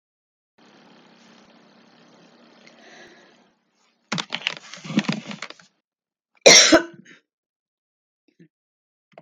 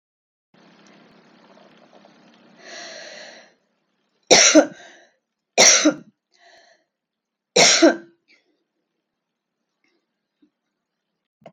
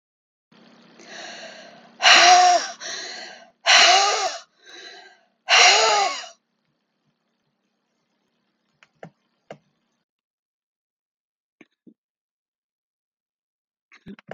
cough_length: 9.2 s
cough_amplitude: 32768
cough_signal_mean_std_ratio: 0.21
three_cough_length: 11.5 s
three_cough_amplitude: 32768
three_cough_signal_mean_std_ratio: 0.25
exhalation_length: 14.3 s
exhalation_amplitude: 31960
exhalation_signal_mean_std_ratio: 0.32
survey_phase: beta (2021-08-13 to 2022-03-07)
age: 65+
gender: Female
wearing_mask: 'No'
symptom_cough_any: true
smoker_status: Never smoked
respiratory_condition_asthma: true
respiratory_condition_other: false
recruitment_source: REACT
submission_delay: 2 days
covid_test_result: Negative
covid_test_method: RT-qPCR
influenza_a_test_result: Negative
influenza_b_test_result: Negative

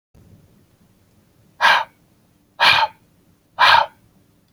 exhalation_length: 4.5 s
exhalation_amplitude: 30019
exhalation_signal_mean_std_ratio: 0.34
survey_phase: alpha (2021-03-01 to 2021-08-12)
age: 18-44
gender: Male
wearing_mask: 'No'
symptom_none: true
smoker_status: Never smoked
respiratory_condition_asthma: false
respiratory_condition_other: false
recruitment_source: REACT
submission_delay: 1 day
covid_test_result: Negative
covid_test_method: RT-qPCR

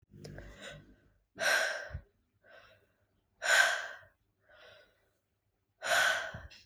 exhalation_length: 6.7 s
exhalation_amplitude: 7610
exhalation_signal_mean_std_ratio: 0.39
survey_phase: beta (2021-08-13 to 2022-03-07)
age: 18-44
gender: Female
wearing_mask: 'No'
symptom_cough_any: true
symptom_runny_or_blocked_nose: true
symptom_fatigue: true
symptom_headache: true
symptom_change_to_sense_of_smell_or_taste: true
symptom_loss_of_taste: true
symptom_other: true
symptom_onset: 3 days
smoker_status: Never smoked
respiratory_condition_asthma: false
respiratory_condition_other: false
recruitment_source: REACT
submission_delay: 1 day
covid_test_result: Negative
covid_test_method: RT-qPCR
influenza_a_test_result: Negative
influenza_b_test_result: Negative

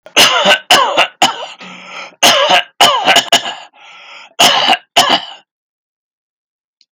cough_length: 6.9 s
cough_amplitude: 32768
cough_signal_mean_std_ratio: 0.54
survey_phase: beta (2021-08-13 to 2022-03-07)
age: 65+
gender: Male
wearing_mask: 'No'
symptom_none: true
smoker_status: Never smoked
respiratory_condition_asthma: false
respiratory_condition_other: false
recruitment_source: REACT
submission_delay: 1 day
covid_test_result: Negative
covid_test_method: RT-qPCR
influenza_a_test_result: Negative
influenza_b_test_result: Negative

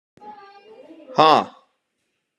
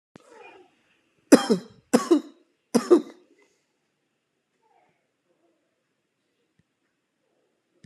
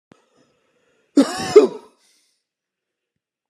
exhalation_length: 2.4 s
exhalation_amplitude: 29471
exhalation_signal_mean_std_ratio: 0.27
three_cough_length: 7.9 s
three_cough_amplitude: 32261
three_cough_signal_mean_std_ratio: 0.2
cough_length: 3.5 s
cough_amplitude: 32768
cough_signal_mean_std_ratio: 0.23
survey_phase: alpha (2021-03-01 to 2021-08-12)
age: 18-44
gender: Male
wearing_mask: 'No'
symptom_none: true
smoker_status: Never smoked
respiratory_condition_asthma: false
respiratory_condition_other: true
recruitment_source: REACT
submission_delay: 0 days
covid_test_result: Negative
covid_test_method: RT-qPCR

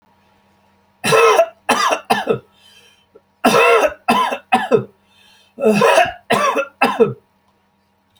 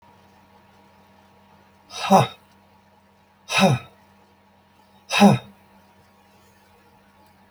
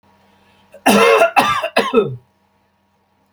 three_cough_length: 8.2 s
three_cough_amplitude: 30236
three_cough_signal_mean_std_ratio: 0.52
exhalation_length: 7.5 s
exhalation_amplitude: 25910
exhalation_signal_mean_std_ratio: 0.27
cough_length: 3.3 s
cough_amplitude: 31049
cough_signal_mean_std_ratio: 0.47
survey_phase: beta (2021-08-13 to 2022-03-07)
age: 65+
gender: Male
wearing_mask: 'No'
symptom_none: true
smoker_status: Never smoked
respiratory_condition_asthma: false
respiratory_condition_other: false
recruitment_source: REACT
submission_delay: 1 day
covid_test_result: Negative
covid_test_method: RT-qPCR
influenza_a_test_result: Unknown/Void
influenza_b_test_result: Unknown/Void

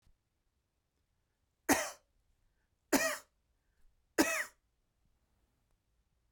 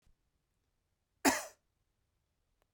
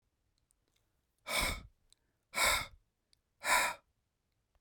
three_cough_length: 6.3 s
three_cough_amplitude: 7102
three_cough_signal_mean_std_ratio: 0.24
cough_length: 2.7 s
cough_amplitude: 6813
cough_signal_mean_std_ratio: 0.18
exhalation_length: 4.6 s
exhalation_amplitude: 4805
exhalation_signal_mean_std_ratio: 0.35
survey_phase: beta (2021-08-13 to 2022-03-07)
age: 18-44
gender: Male
wearing_mask: 'No'
symptom_other: true
smoker_status: Never smoked
respiratory_condition_asthma: false
respiratory_condition_other: false
recruitment_source: REACT
submission_delay: 3 days
covid_test_result: Negative
covid_test_method: RT-qPCR
influenza_a_test_result: Negative
influenza_b_test_result: Negative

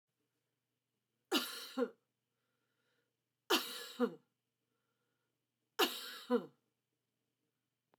three_cough_length: 8.0 s
three_cough_amplitude: 4444
three_cough_signal_mean_std_ratio: 0.28
survey_phase: beta (2021-08-13 to 2022-03-07)
age: 65+
gender: Female
wearing_mask: 'No'
symptom_change_to_sense_of_smell_or_taste: true
symptom_onset: 12 days
smoker_status: Never smoked
respiratory_condition_asthma: false
respiratory_condition_other: false
recruitment_source: REACT
submission_delay: 2 days
covid_test_result: Negative
covid_test_method: RT-qPCR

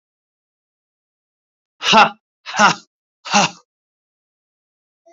exhalation_length: 5.1 s
exhalation_amplitude: 32767
exhalation_signal_mean_std_ratio: 0.27
survey_phase: beta (2021-08-13 to 2022-03-07)
age: 18-44
gender: Male
wearing_mask: 'No'
symptom_cough_any: true
symptom_onset: 4 days
smoker_status: Never smoked
respiratory_condition_asthma: false
respiratory_condition_other: false
recruitment_source: Test and Trace
submission_delay: 2 days
covid_test_result: Positive
covid_test_method: RT-qPCR
covid_ct_value: 17.8
covid_ct_gene: S gene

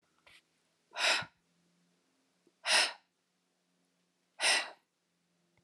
exhalation_length: 5.6 s
exhalation_amplitude: 6265
exhalation_signal_mean_std_ratio: 0.29
survey_phase: alpha (2021-03-01 to 2021-08-12)
age: 45-64
gender: Female
wearing_mask: 'No'
symptom_shortness_of_breath: true
symptom_fatigue: true
symptom_onset: 13 days
smoker_status: Ex-smoker
respiratory_condition_asthma: false
respiratory_condition_other: true
recruitment_source: REACT
submission_delay: 2 days
covid_test_result: Negative
covid_test_method: RT-qPCR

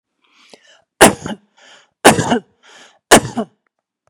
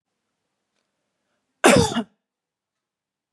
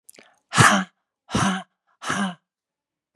three_cough_length: 4.1 s
three_cough_amplitude: 32768
three_cough_signal_mean_std_ratio: 0.29
cough_length: 3.3 s
cough_amplitude: 29231
cough_signal_mean_std_ratio: 0.24
exhalation_length: 3.2 s
exhalation_amplitude: 28453
exhalation_signal_mean_std_ratio: 0.38
survey_phase: beta (2021-08-13 to 2022-03-07)
age: 45-64
gender: Female
wearing_mask: 'No'
symptom_none: true
smoker_status: Never smoked
respiratory_condition_asthma: false
respiratory_condition_other: false
recruitment_source: REACT
submission_delay: 4 days
covid_test_result: Negative
covid_test_method: RT-qPCR
influenza_a_test_result: Negative
influenza_b_test_result: Negative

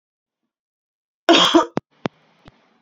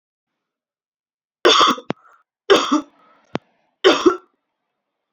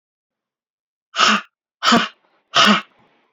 cough_length: 2.8 s
cough_amplitude: 32552
cough_signal_mean_std_ratio: 0.29
three_cough_length: 5.1 s
three_cough_amplitude: 29379
three_cough_signal_mean_std_ratio: 0.32
exhalation_length: 3.3 s
exhalation_amplitude: 28814
exhalation_signal_mean_std_ratio: 0.38
survey_phase: beta (2021-08-13 to 2022-03-07)
age: 18-44
gender: Female
wearing_mask: 'No'
symptom_cough_any: true
symptom_runny_or_blocked_nose: true
symptom_sore_throat: true
symptom_onset: 3 days
smoker_status: Never smoked
respiratory_condition_asthma: false
respiratory_condition_other: false
recruitment_source: Test and Trace
submission_delay: 1 day
covid_test_result: Positive
covid_test_method: RT-qPCR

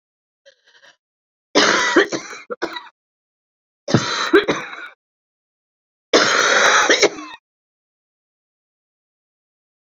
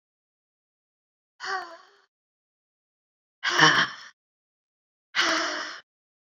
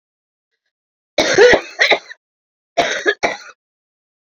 three_cough_length: 10.0 s
three_cough_amplitude: 31148
three_cough_signal_mean_std_ratio: 0.38
exhalation_length: 6.3 s
exhalation_amplitude: 25651
exhalation_signal_mean_std_ratio: 0.31
cough_length: 4.4 s
cough_amplitude: 28661
cough_signal_mean_std_ratio: 0.37
survey_phase: beta (2021-08-13 to 2022-03-07)
age: 45-64
gender: Female
wearing_mask: 'No'
symptom_cough_any: true
symptom_runny_or_blocked_nose: true
symptom_shortness_of_breath: true
symptom_sore_throat: true
symptom_fatigue: true
symptom_headache: true
symptom_change_to_sense_of_smell_or_taste: true
symptom_loss_of_taste: true
symptom_onset: 3 days
smoker_status: Never smoked
respiratory_condition_asthma: true
respiratory_condition_other: false
recruitment_source: Test and Trace
submission_delay: 2 days
covid_test_result: Positive
covid_test_method: ePCR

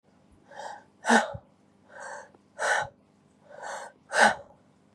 exhalation_length: 4.9 s
exhalation_amplitude: 16108
exhalation_signal_mean_std_ratio: 0.35
survey_phase: beta (2021-08-13 to 2022-03-07)
age: 45-64
gender: Female
wearing_mask: 'No'
symptom_cough_any: true
symptom_runny_or_blocked_nose: true
symptom_shortness_of_breath: true
symptom_fatigue: true
symptom_headache: true
symptom_change_to_sense_of_smell_or_taste: true
symptom_onset: 2 days
smoker_status: Never smoked
respiratory_condition_asthma: true
respiratory_condition_other: false
recruitment_source: Test and Trace
submission_delay: 2 days
covid_test_result: Positive
covid_test_method: RT-qPCR
covid_ct_value: 21.5
covid_ct_gene: ORF1ab gene
covid_ct_mean: 21.7
covid_viral_load: 76000 copies/ml
covid_viral_load_category: Low viral load (10K-1M copies/ml)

